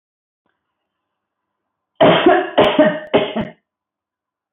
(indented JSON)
{
  "three_cough_length": "4.5 s",
  "three_cough_amplitude": 26983,
  "three_cough_signal_mean_std_ratio": 0.4,
  "survey_phase": "beta (2021-08-13 to 2022-03-07)",
  "age": "65+",
  "gender": "Female",
  "wearing_mask": "No",
  "symptom_none": true,
  "smoker_status": "Ex-smoker",
  "respiratory_condition_asthma": false,
  "respiratory_condition_other": false,
  "recruitment_source": "REACT",
  "submission_delay": "1 day",
  "covid_test_result": "Negative",
  "covid_test_method": "RT-qPCR",
  "influenza_a_test_result": "Negative",
  "influenza_b_test_result": "Negative"
}